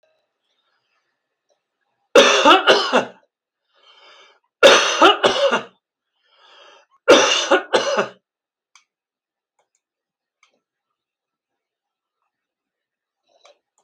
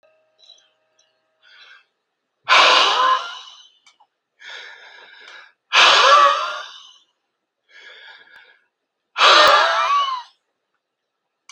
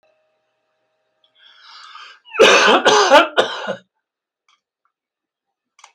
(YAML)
three_cough_length: 13.8 s
three_cough_amplitude: 32767
three_cough_signal_mean_std_ratio: 0.32
exhalation_length: 11.5 s
exhalation_amplitude: 32768
exhalation_signal_mean_std_ratio: 0.4
cough_length: 5.9 s
cough_amplitude: 32197
cough_signal_mean_std_ratio: 0.35
survey_phase: beta (2021-08-13 to 2022-03-07)
age: 65+
gender: Male
wearing_mask: 'No'
symptom_none: true
smoker_status: Never smoked
respiratory_condition_asthma: false
respiratory_condition_other: false
recruitment_source: REACT
submission_delay: 15 days
covid_test_result: Negative
covid_test_method: RT-qPCR